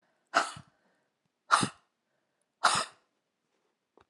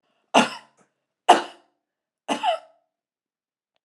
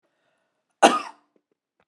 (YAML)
exhalation_length: 4.1 s
exhalation_amplitude: 14162
exhalation_signal_mean_std_ratio: 0.26
three_cough_length: 3.8 s
three_cough_amplitude: 32318
three_cough_signal_mean_std_ratio: 0.25
cough_length: 1.9 s
cough_amplitude: 32754
cough_signal_mean_std_ratio: 0.21
survey_phase: alpha (2021-03-01 to 2021-08-12)
age: 65+
gender: Female
wearing_mask: 'No'
symptom_none: true
smoker_status: Ex-smoker
respiratory_condition_asthma: true
respiratory_condition_other: false
recruitment_source: REACT
submission_delay: 3 days
covid_test_result: Negative
covid_test_method: RT-qPCR